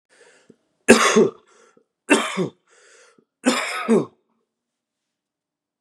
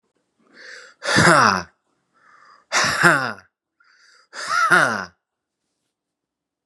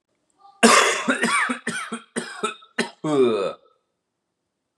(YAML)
three_cough_length: 5.8 s
three_cough_amplitude: 32768
three_cough_signal_mean_std_ratio: 0.33
exhalation_length: 6.7 s
exhalation_amplitude: 32767
exhalation_signal_mean_std_ratio: 0.39
cough_length: 4.8 s
cough_amplitude: 31379
cough_signal_mean_std_ratio: 0.49
survey_phase: beta (2021-08-13 to 2022-03-07)
age: 18-44
gender: Male
wearing_mask: 'No'
symptom_cough_any: true
symptom_runny_or_blocked_nose: true
symptom_sore_throat: true
symptom_headache: true
symptom_onset: 3 days
smoker_status: Never smoked
respiratory_condition_asthma: true
respiratory_condition_other: false
recruitment_source: Test and Trace
submission_delay: 2 days
covid_test_result: Positive
covid_test_method: RT-qPCR
covid_ct_value: 22.8
covid_ct_gene: N gene